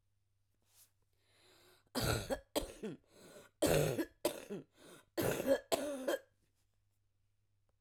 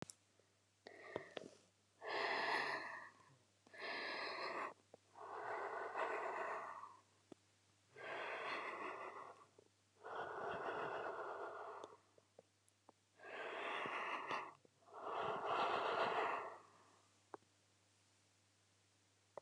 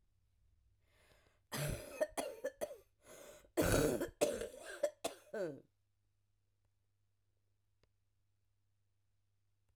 {
  "three_cough_length": "7.8 s",
  "three_cough_amplitude": 4160,
  "three_cough_signal_mean_std_ratio": 0.41,
  "exhalation_length": "19.4 s",
  "exhalation_amplitude": 1489,
  "exhalation_signal_mean_std_ratio": 0.64,
  "cough_length": "9.8 s",
  "cough_amplitude": 3698,
  "cough_signal_mean_std_ratio": 0.35,
  "survey_phase": "alpha (2021-03-01 to 2021-08-12)",
  "age": "45-64",
  "gender": "Female",
  "wearing_mask": "No",
  "symptom_cough_any": true,
  "symptom_new_continuous_cough": true,
  "symptom_shortness_of_breath": true,
  "symptom_fever_high_temperature": true,
  "symptom_headache": true,
  "symptom_change_to_sense_of_smell_or_taste": true,
  "symptom_loss_of_taste": true,
  "smoker_status": "Never smoked",
  "respiratory_condition_asthma": false,
  "respiratory_condition_other": false,
  "recruitment_source": "Test and Trace",
  "submission_delay": "1 day",
  "covid_test_result": "Positive",
  "covid_test_method": "RT-qPCR"
}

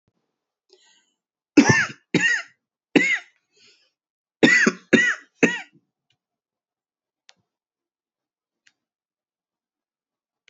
{
  "cough_length": "10.5 s",
  "cough_amplitude": 28279,
  "cough_signal_mean_std_ratio": 0.28,
  "survey_phase": "beta (2021-08-13 to 2022-03-07)",
  "age": "45-64",
  "gender": "Female",
  "wearing_mask": "No",
  "symptom_cough_any": true,
  "symptom_runny_or_blocked_nose": true,
  "symptom_shortness_of_breath": true,
  "symptom_sore_throat": true,
  "symptom_fatigue": true,
  "symptom_fever_high_temperature": true,
  "symptom_headache": true,
  "symptom_change_to_sense_of_smell_or_taste": true,
  "symptom_loss_of_taste": true,
  "symptom_other": true,
  "symptom_onset": "4 days",
  "smoker_status": "Never smoked",
  "respiratory_condition_asthma": false,
  "respiratory_condition_other": false,
  "recruitment_source": "Test and Trace",
  "submission_delay": "2 days",
  "covid_test_result": "Positive",
  "covid_test_method": "RT-qPCR"
}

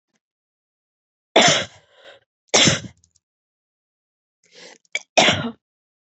{
  "three_cough_length": "6.1 s",
  "three_cough_amplitude": 32768,
  "three_cough_signal_mean_std_ratio": 0.29,
  "survey_phase": "beta (2021-08-13 to 2022-03-07)",
  "age": "18-44",
  "gender": "Female",
  "wearing_mask": "No",
  "symptom_cough_any": true,
  "symptom_onset": "11 days",
  "smoker_status": "Never smoked",
  "respiratory_condition_asthma": false,
  "respiratory_condition_other": false,
  "recruitment_source": "REACT",
  "submission_delay": "3 days",
  "covid_test_result": "Negative",
  "covid_test_method": "RT-qPCR",
  "influenza_a_test_result": "Negative",
  "influenza_b_test_result": "Negative"
}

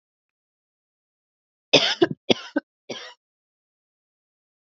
{
  "three_cough_length": "4.7 s",
  "three_cough_amplitude": 32768,
  "three_cough_signal_mean_std_ratio": 0.21,
  "survey_phase": "beta (2021-08-13 to 2022-03-07)",
  "age": "45-64",
  "gender": "Female",
  "wearing_mask": "No",
  "symptom_cough_any": true,
  "symptom_runny_or_blocked_nose": true,
  "symptom_shortness_of_breath": true,
  "symptom_sore_throat": true,
  "symptom_fatigue": true,
  "symptom_fever_high_temperature": true,
  "symptom_headache": true,
  "symptom_change_to_sense_of_smell_or_taste": true,
  "symptom_onset": "3 days",
  "smoker_status": "Never smoked",
  "respiratory_condition_asthma": false,
  "respiratory_condition_other": false,
  "recruitment_source": "Test and Trace",
  "submission_delay": "1 day",
  "covid_test_result": "Positive",
  "covid_test_method": "RT-qPCR",
  "covid_ct_value": 15.1,
  "covid_ct_gene": "ORF1ab gene",
  "covid_ct_mean": 15.3,
  "covid_viral_load": "9800000 copies/ml",
  "covid_viral_load_category": "High viral load (>1M copies/ml)"
}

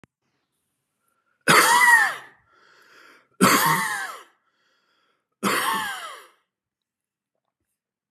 {
  "three_cough_length": "8.1 s",
  "three_cough_amplitude": 24910,
  "three_cough_signal_mean_std_ratio": 0.37,
  "survey_phase": "beta (2021-08-13 to 2022-03-07)",
  "age": "45-64",
  "gender": "Male",
  "wearing_mask": "No",
  "symptom_none": true,
  "smoker_status": "Never smoked",
  "respiratory_condition_asthma": false,
  "respiratory_condition_other": false,
  "recruitment_source": "Test and Trace",
  "submission_delay": "2 days",
  "covid_test_result": "Negative",
  "covid_test_method": "RT-qPCR"
}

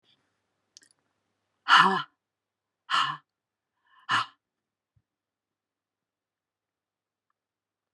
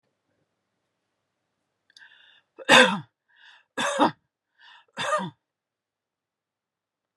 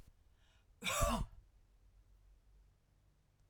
{
  "exhalation_length": "7.9 s",
  "exhalation_amplitude": 17462,
  "exhalation_signal_mean_std_ratio": 0.21,
  "three_cough_length": "7.2 s",
  "three_cough_amplitude": 26805,
  "three_cough_signal_mean_std_ratio": 0.24,
  "cough_length": "3.5 s",
  "cough_amplitude": 2736,
  "cough_signal_mean_std_ratio": 0.33,
  "survey_phase": "alpha (2021-03-01 to 2021-08-12)",
  "age": "45-64",
  "gender": "Female",
  "wearing_mask": "No",
  "symptom_none": true,
  "smoker_status": "Never smoked",
  "respiratory_condition_asthma": false,
  "respiratory_condition_other": false,
  "recruitment_source": "REACT",
  "submission_delay": "1 day",
  "covid_test_result": "Negative",
  "covid_test_method": "RT-qPCR"
}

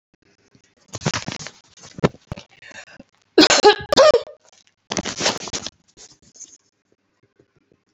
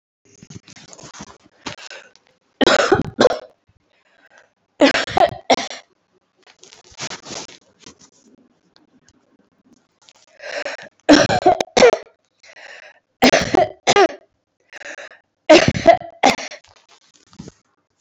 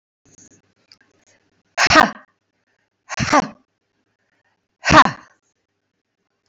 {
  "cough_length": "7.9 s",
  "cough_amplitude": 31898,
  "cough_signal_mean_std_ratio": 0.29,
  "three_cough_length": "18.0 s",
  "three_cough_amplitude": 32195,
  "three_cough_signal_mean_std_ratio": 0.32,
  "exhalation_length": "6.5 s",
  "exhalation_amplitude": 32768,
  "exhalation_signal_mean_std_ratio": 0.25,
  "survey_phase": "beta (2021-08-13 to 2022-03-07)",
  "age": "65+",
  "gender": "Female",
  "wearing_mask": "No",
  "symptom_runny_or_blocked_nose": true,
  "symptom_headache": true,
  "symptom_onset": "3 days",
  "smoker_status": "Ex-smoker",
  "respiratory_condition_asthma": false,
  "respiratory_condition_other": false,
  "recruitment_source": "Test and Trace",
  "submission_delay": "2 days",
  "covid_test_result": "Positive",
  "covid_test_method": "RT-qPCR",
  "covid_ct_value": 20.8,
  "covid_ct_gene": "ORF1ab gene"
}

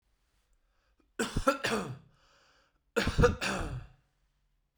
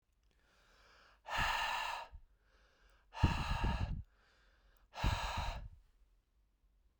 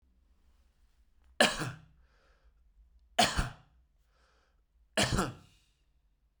{
  "cough_length": "4.8 s",
  "cough_amplitude": 9412,
  "cough_signal_mean_std_ratio": 0.39,
  "exhalation_length": "7.0 s",
  "exhalation_amplitude": 5344,
  "exhalation_signal_mean_std_ratio": 0.47,
  "three_cough_length": "6.4 s",
  "three_cough_amplitude": 12448,
  "three_cough_signal_mean_std_ratio": 0.28,
  "survey_phase": "beta (2021-08-13 to 2022-03-07)",
  "age": "18-44",
  "gender": "Male",
  "wearing_mask": "No",
  "symptom_cough_any": true,
  "symptom_runny_or_blocked_nose": true,
  "symptom_shortness_of_breath": true,
  "symptom_sore_throat": true,
  "symptom_fever_high_temperature": true,
  "symptom_headache": true,
  "symptom_other": true,
  "smoker_status": "Never smoked",
  "respiratory_condition_asthma": false,
  "respiratory_condition_other": false,
  "recruitment_source": "Test and Trace",
  "submission_delay": "2 days",
  "covid_test_result": "Positive",
  "covid_test_method": "ePCR"
}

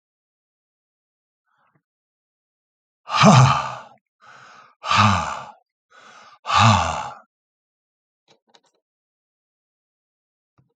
{
  "exhalation_length": "10.8 s",
  "exhalation_amplitude": 30095,
  "exhalation_signal_mean_std_ratio": 0.29,
  "survey_phase": "alpha (2021-03-01 to 2021-08-12)",
  "age": "65+",
  "gender": "Male",
  "wearing_mask": "No",
  "symptom_cough_any": true,
  "symptom_fatigue": true,
  "symptom_onset": "3 days",
  "smoker_status": "Ex-smoker",
  "respiratory_condition_asthma": false,
  "respiratory_condition_other": false,
  "recruitment_source": "Test and Trace",
  "submission_delay": "1 day",
  "covid_test_result": "Positive",
  "covid_test_method": "RT-qPCR",
  "covid_ct_value": 21.4,
  "covid_ct_gene": "ORF1ab gene",
  "covid_ct_mean": 22.1,
  "covid_viral_load": "55000 copies/ml",
  "covid_viral_load_category": "Low viral load (10K-1M copies/ml)"
}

